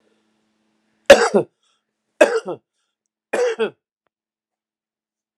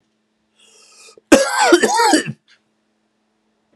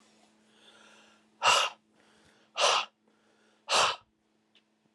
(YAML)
three_cough_length: 5.4 s
three_cough_amplitude: 32768
three_cough_signal_mean_std_ratio: 0.25
cough_length: 3.8 s
cough_amplitude: 32768
cough_signal_mean_std_ratio: 0.39
exhalation_length: 4.9 s
exhalation_amplitude: 11761
exhalation_signal_mean_std_ratio: 0.33
survey_phase: beta (2021-08-13 to 2022-03-07)
age: 45-64
gender: Male
wearing_mask: 'No'
symptom_sore_throat: true
symptom_fatigue: true
symptom_onset: 2 days
smoker_status: Never smoked
respiratory_condition_asthma: false
respiratory_condition_other: false
recruitment_source: REACT
submission_delay: 1 day
covid_test_result: Negative
covid_test_method: RT-qPCR